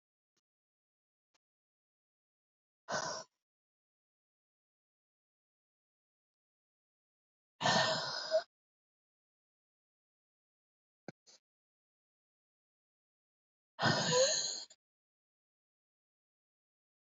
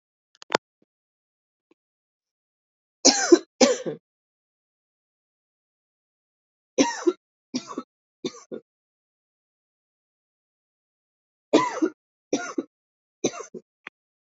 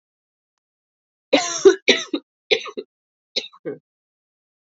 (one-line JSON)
{"exhalation_length": "17.1 s", "exhalation_amplitude": 4062, "exhalation_signal_mean_std_ratio": 0.25, "three_cough_length": "14.3 s", "three_cough_amplitude": 28014, "three_cough_signal_mean_std_ratio": 0.22, "cough_length": "4.7 s", "cough_amplitude": 28379, "cough_signal_mean_std_ratio": 0.27, "survey_phase": "beta (2021-08-13 to 2022-03-07)", "age": "18-44", "gender": "Female", "wearing_mask": "No", "symptom_cough_any": true, "symptom_new_continuous_cough": true, "symptom_runny_or_blocked_nose": true, "symptom_sore_throat": true, "symptom_fatigue": true, "symptom_fever_high_temperature": true, "symptom_headache": true, "smoker_status": "Ex-smoker", "respiratory_condition_asthma": false, "respiratory_condition_other": false, "recruitment_source": "Test and Trace", "submission_delay": "2 days", "covid_test_result": "Positive", "covid_test_method": "ePCR"}